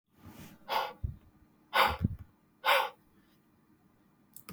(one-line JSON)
{"exhalation_length": "4.5 s", "exhalation_amplitude": 8185, "exhalation_signal_mean_std_ratio": 0.36, "survey_phase": "beta (2021-08-13 to 2022-03-07)", "age": "65+", "gender": "Male", "wearing_mask": "No", "symptom_cough_any": true, "symptom_runny_or_blocked_nose": true, "symptom_fatigue": true, "symptom_headache": true, "symptom_onset": "4 days", "smoker_status": "Ex-smoker", "respiratory_condition_asthma": false, "respiratory_condition_other": false, "recruitment_source": "Test and Trace", "submission_delay": "1 day", "covid_test_result": "Positive", "covid_test_method": "RT-qPCR"}